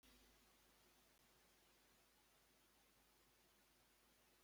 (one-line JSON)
{"cough_length": "4.4 s", "cough_amplitude": 36, "cough_signal_mean_std_ratio": 1.14, "survey_phase": "beta (2021-08-13 to 2022-03-07)", "age": "65+", "gender": "Male", "wearing_mask": "No", "symptom_runny_or_blocked_nose": true, "symptom_onset": "8 days", "smoker_status": "Never smoked", "respiratory_condition_asthma": false, "respiratory_condition_other": false, "recruitment_source": "REACT", "submission_delay": "2 days", "covid_test_result": "Negative", "covid_test_method": "RT-qPCR"}